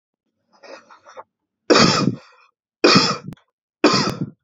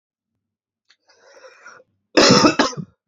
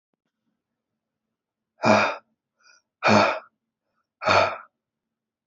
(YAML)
three_cough_length: 4.4 s
three_cough_amplitude: 32317
three_cough_signal_mean_std_ratio: 0.4
cough_length: 3.1 s
cough_amplitude: 32767
cough_signal_mean_std_ratio: 0.33
exhalation_length: 5.5 s
exhalation_amplitude: 21725
exhalation_signal_mean_std_ratio: 0.32
survey_phase: beta (2021-08-13 to 2022-03-07)
age: 18-44
gender: Male
wearing_mask: 'No'
symptom_runny_or_blocked_nose: true
symptom_abdominal_pain: true
symptom_fatigue: true
symptom_fever_high_temperature: true
symptom_headache: true
smoker_status: Never smoked
respiratory_condition_asthma: false
respiratory_condition_other: false
recruitment_source: Test and Trace
submission_delay: 1 day
covid_test_result: Positive
covid_test_method: RT-qPCR
covid_ct_value: 22.9
covid_ct_gene: E gene